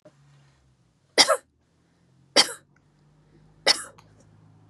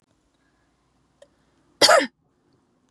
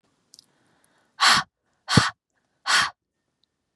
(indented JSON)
{
  "three_cough_length": "4.7 s",
  "three_cough_amplitude": 31500,
  "three_cough_signal_mean_std_ratio": 0.23,
  "cough_length": "2.9 s",
  "cough_amplitude": 30016,
  "cough_signal_mean_std_ratio": 0.23,
  "exhalation_length": "3.8 s",
  "exhalation_amplitude": 26795,
  "exhalation_signal_mean_std_ratio": 0.31,
  "survey_phase": "beta (2021-08-13 to 2022-03-07)",
  "age": "18-44",
  "gender": "Female",
  "wearing_mask": "No",
  "symptom_none": true,
  "symptom_onset": "12 days",
  "smoker_status": "Never smoked",
  "respiratory_condition_asthma": false,
  "respiratory_condition_other": false,
  "recruitment_source": "REACT",
  "submission_delay": "2 days",
  "covid_test_result": "Negative",
  "covid_test_method": "RT-qPCR",
  "influenza_a_test_result": "Negative",
  "influenza_b_test_result": "Negative"
}